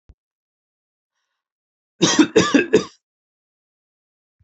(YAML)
cough_length: 4.4 s
cough_amplitude: 28069
cough_signal_mean_std_ratio: 0.28
survey_phase: beta (2021-08-13 to 2022-03-07)
age: 45-64
gender: Male
wearing_mask: 'No'
symptom_none: true
smoker_status: Never smoked
respiratory_condition_asthma: true
respiratory_condition_other: false
recruitment_source: REACT
submission_delay: 1 day
covid_test_result: Negative
covid_test_method: RT-qPCR